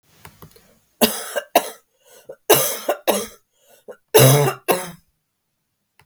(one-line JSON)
{"three_cough_length": "6.1 s", "three_cough_amplitude": 32768, "three_cough_signal_mean_std_ratio": 0.36, "survey_phase": "beta (2021-08-13 to 2022-03-07)", "age": "45-64", "gender": "Female", "wearing_mask": "No", "symptom_cough_any": true, "symptom_runny_or_blocked_nose": true, "symptom_diarrhoea": true, "symptom_fatigue": true, "symptom_fever_high_temperature": true, "symptom_change_to_sense_of_smell_or_taste": true, "symptom_loss_of_taste": true, "symptom_onset": "2 days", "smoker_status": "Never smoked", "respiratory_condition_asthma": false, "respiratory_condition_other": false, "recruitment_source": "Test and Trace", "submission_delay": "1 day", "covid_test_result": "Positive", "covid_test_method": "RT-qPCR", "covid_ct_value": 18.0, "covid_ct_gene": "ORF1ab gene", "covid_ct_mean": 18.6, "covid_viral_load": "820000 copies/ml", "covid_viral_load_category": "Low viral load (10K-1M copies/ml)"}